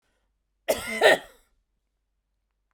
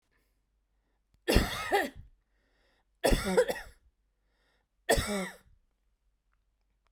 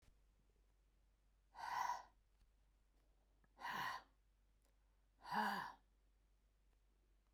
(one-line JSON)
{"cough_length": "2.7 s", "cough_amplitude": 23474, "cough_signal_mean_std_ratio": 0.27, "three_cough_length": "6.9 s", "three_cough_amplitude": 14604, "three_cough_signal_mean_std_ratio": 0.34, "exhalation_length": "7.3 s", "exhalation_amplitude": 1009, "exhalation_signal_mean_std_ratio": 0.38, "survey_phase": "beta (2021-08-13 to 2022-03-07)", "age": "45-64", "gender": "Female", "wearing_mask": "No", "symptom_none": true, "smoker_status": "Ex-smoker", "respiratory_condition_asthma": false, "respiratory_condition_other": false, "recruitment_source": "REACT", "submission_delay": "1 day", "covid_test_result": "Negative", "covid_test_method": "RT-qPCR"}